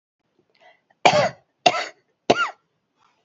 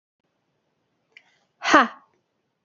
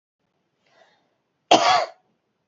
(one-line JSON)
{"three_cough_length": "3.2 s", "three_cough_amplitude": 30122, "three_cough_signal_mean_std_ratio": 0.31, "exhalation_length": "2.6 s", "exhalation_amplitude": 28330, "exhalation_signal_mean_std_ratio": 0.21, "cough_length": "2.5 s", "cough_amplitude": 30497, "cough_signal_mean_std_ratio": 0.29, "survey_phase": "beta (2021-08-13 to 2022-03-07)", "age": "45-64", "gender": "Female", "wearing_mask": "No", "symptom_none": true, "symptom_onset": "12 days", "smoker_status": "Never smoked", "respiratory_condition_asthma": false, "respiratory_condition_other": false, "recruitment_source": "REACT", "submission_delay": "2 days", "covid_test_result": "Negative", "covid_test_method": "RT-qPCR", "influenza_a_test_result": "Negative", "influenza_b_test_result": "Negative"}